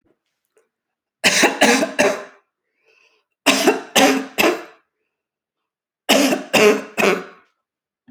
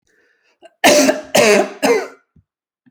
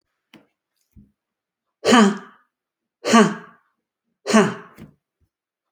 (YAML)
three_cough_length: 8.1 s
three_cough_amplitude: 32768
three_cough_signal_mean_std_ratio: 0.44
cough_length: 2.9 s
cough_amplitude: 32768
cough_signal_mean_std_ratio: 0.47
exhalation_length: 5.7 s
exhalation_amplitude: 29980
exhalation_signal_mean_std_ratio: 0.3
survey_phase: beta (2021-08-13 to 2022-03-07)
age: 45-64
gender: Female
wearing_mask: 'No'
symptom_none: true
smoker_status: Ex-smoker
respiratory_condition_asthma: false
respiratory_condition_other: false
recruitment_source: REACT
submission_delay: 1 day
covid_test_result: Negative
covid_test_method: RT-qPCR